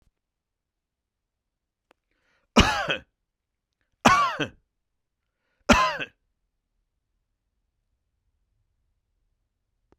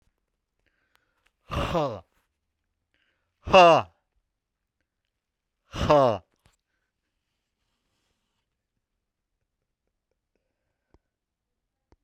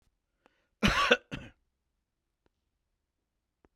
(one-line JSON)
{"three_cough_length": "10.0 s", "three_cough_amplitude": 29223, "three_cough_signal_mean_std_ratio": 0.23, "exhalation_length": "12.0 s", "exhalation_amplitude": 21091, "exhalation_signal_mean_std_ratio": 0.21, "cough_length": "3.8 s", "cough_amplitude": 12497, "cough_signal_mean_std_ratio": 0.24, "survey_phase": "beta (2021-08-13 to 2022-03-07)", "age": "45-64", "gender": "Male", "wearing_mask": "Yes", "symptom_cough_any": true, "symptom_runny_or_blocked_nose": true, "symptom_sore_throat": true, "symptom_abdominal_pain": true, "symptom_diarrhoea": true, "symptom_fever_high_temperature": true, "symptom_onset": "4 days", "smoker_status": "Never smoked", "respiratory_condition_asthma": false, "respiratory_condition_other": false, "recruitment_source": "Test and Trace", "submission_delay": "2 days", "covid_test_result": "Positive", "covid_test_method": "RT-qPCR", "covid_ct_value": 18.8, "covid_ct_gene": "N gene"}